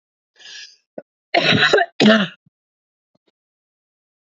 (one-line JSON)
{"cough_length": "4.4 s", "cough_amplitude": 27436, "cough_signal_mean_std_ratio": 0.35, "survey_phase": "beta (2021-08-13 to 2022-03-07)", "age": "45-64", "gender": "Female", "wearing_mask": "No", "symptom_cough_any": true, "symptom_runny_or_blocked_nose": true, "symptom_sore_throat": true, "symptom_headache": true, "symptom_other": true, "smoker_status": "Never smoked", "respiratory_condition_asthma": false, "respiratory_condition_other": false, "recruitment_source": "Test and Trace", "submission_delay": "2 days", "covid_test_result": "Positive", "covid_test_method": "RT-qPCR", "covid_ct_value": 30.6, "covid_ct_gene": "ORF1ab gene"}